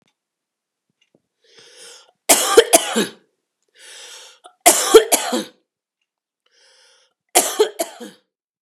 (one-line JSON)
{"three_cough_length": "8.6 s", "three_cough_amplitude": 32768, "three_cough_signal_mean_std_ratio": 0.3, "survey_phase": "beta (2021-08-13 to 2022-03-07)", "age": "18-44", "gender": "Female", "wearing_mask": "No", "symptom_fatigue": true, "smoker_status": "Ex-smoker", "respiratory_condition_asthma": true, "respiratory_condition_other": false, "recruitment_source": "REACT", "submission_delay": "2 days", "covid_test_result": "Negative", "covid_test_method": "RT-qPCR", "influenza_a_test_result": "Negative", "influenza_b_test_result": "Negative"}